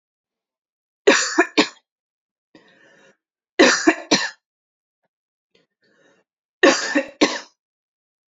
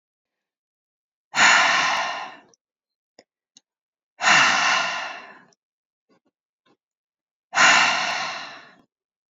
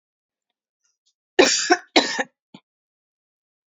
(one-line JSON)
{"three_cough_length": "8.3 s", "three_cough_amplitude": 31493, "three_cough_signal_mean_std_ratio": 0.3, "exhalation_length": "9.3 s", "exhalation_amplitude": 22473, "exhalation_signal_mean_std_ratio": 0.41, "cough_length": "3.7 s", "cough_amplitude": 29138, "cough_signal_mean_std_ratio": 0.28, "survey_phase": "beta (2021-08-13 to 2022-03-07)", "age": "18-44", "gender": "Female", "wearing_mask": "No", "symptom_cough_any": true, "symptom_onset": "2 days", "smoker_status": "Never smoked", "respiratory_condition_asthma": false, "respiratory_condition_other": false, "recruitment_source": "Test and Trace", "submission_delay": "1 day", "covid_test_result": "Positive", "covid_test_method": "RT-qPCR", "covid_ct_value": 30.2, "covid_ct_gene": "N gene", "covid_ct_mean": 30.4, "covid_viral_load": "100 copies/ml", "covid_viral_load_category": "Minimal viral load (< 10K copies/ml)"}